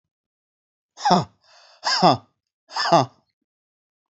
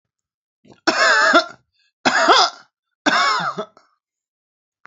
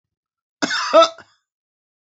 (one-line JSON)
{"exhalation_length": "4.1 s", "exhalation_amplitude": 29385, "exhalation_signal_mean_std_ratio": 0.33, "three_cough_length": "4.9 s", "three_cough_amplitude": 32767, "three_cough_signal_mean_std_ratio": 0.46, "cough_length": "2.0 s", "cough_amplitude": 27811, "cough_signal_mean_std_ratio": 0.32, "survey_phase": "alpha (2021-03-01 to 2021-08-12)", "age": "45-64", "gender": "Female", "wearing_mask": "No", "symptom_cough_any": true, "symptom_shortness_of_breath": true, "symptom_fatigue": true, "symptom_headache": true, "symptom_change_to_sense_of_smell_or_taste": true, "symptom_loss_of_taste": true, "smoker_status": "Ex-smoker", "respiratory_condition_asthma": true, "respiratory_condition_other": false, "recruitment_source": "Test and Trace", "submission_delay": "2 days", "covid_test_result": "Positive", "covid_test_method": "RT-qPCR", "covid_ct_value": 19.6, "covid_ct_gene": "ORF1ab gene", "covid_ct_mean": 20.9, "covid_viral_load": "140000 copies/ml", "covid_viral_load_category": "Low viral load (10K-1M copies/ml)"}